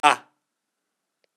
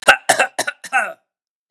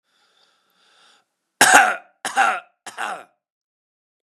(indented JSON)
{
  "exhalation_length": "1.4 s",
  "exhalation_amplitude": 31611,
  "exhalation_signal_mean_std_ratio": 0.19,
  "cough_length": "1.7 s",
  "cough_amplitude": 32768,
  "cough_signal_mean_std_ratio": 0.39,
  "three_cough_length": "4.3 s",
  "three_cough_amplitude": 32768,
  "three_cough_signal_mean_std_ratio": 0.3,
  "survey_phase": "beta (2021-08-13 to 2022-03-07)",
  "age": "45-64",
  "gender": "Male",
  "wearing_mask": "No",
  "symptom_none": true,
  "smoker_status": "Ex-smoker",
  "respiratory_condition_asthma": false,
  "respiratory_condition_other": true,
  "recruitment_source": "REACT",
  "submission_delay": "1 day",
  "covid_test_result": "Negative",
  "covid_test_method": "RT-qPCR",
  "influenza_a_test_result": "Negative",
  "influenza_b_test_result": "Negative"
}